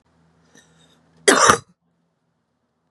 {"cough_length": "2.9 s", "cough_amplitude": 32768, "cough_signal_mean_std_ratio": 0.25, "survey_phase": "beta (2021-08-13 to 2022-03-07)", "age": "45-64", "gender": "Female", "wearing_mask": "No", "symptom_runny_or_blocked_nose": true, "symptom_abdominal_pain": true, "symptom_diarrhoea": true, "symptom_fatigue": true, "symptom_headache": true, "symptom_change_to_sense_of_smell_or_taste": true, "symptom_onset": "2 days", "smoker_status": "Ex-smoker", "respiratory_condition_asthma": false, "respiratory_condition_other": false, "recruitment_source": "Test and Trace", "submission_delay": "2 days", "covid_test_result": "Positive", "covid_test_method": "RT-qPCR", "covid_ct_value": 18.2, "covid_ct_gene": "ORF1ab gene", "covid_ct_mean": 18.7, "covid_viral_load": "740000 copies/ml", "covid_viral_load_category": "Low viral load (10K-1M copies/ml)"}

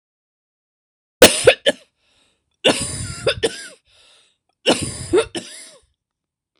{"three_cough_length": "6.6 s", "three_cough_amplitude": 26028, "three_cough_signal_mean_std_ratio": 0.31, "survey_phase": "beta (2021-08-13 to 2022-03-07)", "age": "65+", "gender": "Female", "wearing_mask": "No", "symptom_runny_or_blocked_nose": true, "smoker_status": "Never smoked", "respiratory_condition_asthma": true, "respiratory_condition_other": false, "recruitment_source": "REACT", "submission_delay": "2 days", "covid_test_result": "Negative", "covid_test_method": "RT-qPCR"}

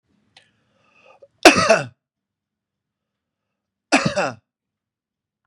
{"cough_length": "5.5 s", "cough_amplitude": 32768, "cough_signal_mean_std_ratio": 0.24, "survey_phase": "beta (2021-08-13 to 2022-03-07)", "age": "45-64", "gender": "Male", "wearing_mask": "No", "symptom_fatigue": true, "symptom_onset": "12 days", "smoker_status": "Ex-smoker", "respiratory_condition_asthma": false, "respiratory_condition_other": false, "recruitment_source": "REACT", "submission_delay": "9 days", "covid_test_result": "Negative", "covid_test_method": "RT-qPCR", "influenza_a_test_result": "Negative", "influenza_b_test_result": "Negative"}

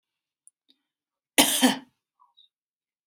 {"cough_length": "3.1 s", "cough_amplitude": 32768, "cough_signal_mean_std_ratio": 0.25, "survey_phase": "beta (2021-08-13 to 2022-03-07)", "age": "18-44", "gender": "Female", "wearing_mask": "No", "symptom_none": true, "smoker_status": "Never smoked", "respiratory_condition_asthma": false, "respiratory_condition_other": false, "recruitment_source": "REACT", "submission_delay": "7 days", "covid_test_result": "Negative", "covid_test_method": "RT-qPCR", "influenza_a_test_result": "Negative", "influenza_b_test_result": "Negative"}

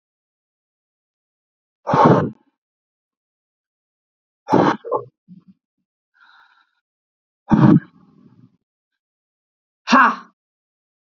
{"exhalation_length": "11.2 s", "exhalation_amplitude": 28566, "exhalation_signal_mean_std_ratio": 0.27, "survey_phase": "beta (2021-08-13 to 2022-03-07)", "age": "18-44", "gender": "Female", "wearing_mask": "No", "symptom_none": true, "smoker_status": "Never smoked", "respiratory_condition_asthma": false, "respiratory_condition_other": false, "recruitment_source": "REACT", "submission_delay": "1 day", "covid_test_result": "Negative", "covid_test_method": "RT-qPCR"}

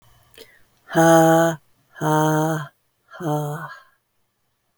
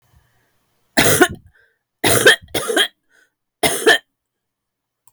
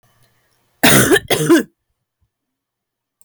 {"exhalation_length": "4.8 s", "exhalation_amplitude": 22084, "exhalation_signal_mean_std_ratio": 0.47, "three_cough_length": "5.1 s", "three_cough_amplitude": 32768, "three_cough_signal_mean_std_ratio": 0.38, "cough_length": "3.2 s", "cough_amplitude": 32768, "cough_signal_mean_std_ratio": 0.38, "survey_phase": "beta (2021-08-13 to 2022-03-07)", "age": "45-64", "gender": "Female", "wearing_mask": "No", "symptom_none": true, "smoker_status": "Ex-smoker", "respiratory_condition_asthma": false, "respiratory_condition_other": false, "recruitment_source": "REACT", "submission_delay": "5 days", "covid_test_result": "Negative", "covid_test_method": "RT-qPCR"}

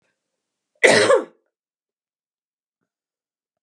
{"cough_length": "3.6 s", "cough_amplitude": 32767, "cough_signal_mean_std_ratio": 0.26, "survey_phase": "beta (2021-08-13 to 2022-03-07)", "age": "18-44", "gender": "Female", "wearing_mask": "No", "symptom_none": true, "smoker_status": "Never smoked", "respiratory_condition_asthma": false, "respiratory_condition_other": false, "recruitment_source": "REACT", "submission_delay": "2 days", "covid_test_result": "Negative", "covid_test_method": "RT-qPCR", "influenza_a_test_result": "Negative", "influenza_b_test_result": "Negative"}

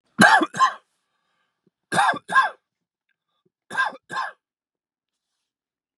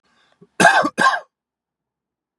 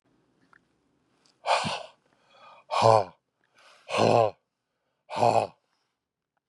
{"three_cough_length": "6.0 s", "three_cough_amplitude": 29890, "three_cough_signal_mean_std_ratio": 0.32, "cough_length": "2.4 s", "cough_amplitude": 32755, "cough_signal_mean_std_ratio": 0.35, "exhalation_length": "6.5 s", "exhalation_amplitude": 21757, "exhalation_signal_mean_std_ratio": 0.32, "survey_phase": "beta (2021-08-13 to 2022-03-07)", "age": "45-64", "gender": "Male", "wearing_mask": "No", "symptom_cough_any": true, "symptom_sore_throat": true, "symptom_fatigue": true, "symptom_headache": true, "symptom_onset": "12 days", "smoker_status": "Never smoked", "respiratory_condition_asthma": false, "respiratory_condition_other": true, "recruitment_source": "REACT", "submission_delay": "0 days", "covid_test_result": "Negative", "covid_test_method": "RT-qPCR", "influenza_a_test_result": "Negative", "influenza_b_test_result": "Negative"}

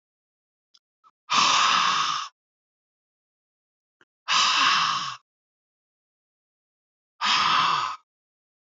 {"exhalation_length": "8.6 s", "exhalation_amplitude": 15946, "exhalation_signal_mean_std_ratio": 0.45, "survey_phase": "alpha (2021-03-01 to 2021-08-12)", "age": "18-44", "gender": "Male", "wearing_mask": "No", "symptom_cough_any": true, "symptom_fatigue": true, "symptom_fever_high_temperature": true, "smoker_status": "Never smoked", "respiratory_condition_asthma": false, "respiratory_condition_other": false, "recruitment_source": "Test and Trace", "submission_delay": "3 days", "covid_test_method": "RT-qPCR", "covid_ct_value": 32.5, "covid_ct_gene": "N gene", "covid_ct_mean": 32.5, "covid_viral_load": "22 copies/ml", "covid_viral_load_category": "Minimal viral load (< 10K copies/ml)"}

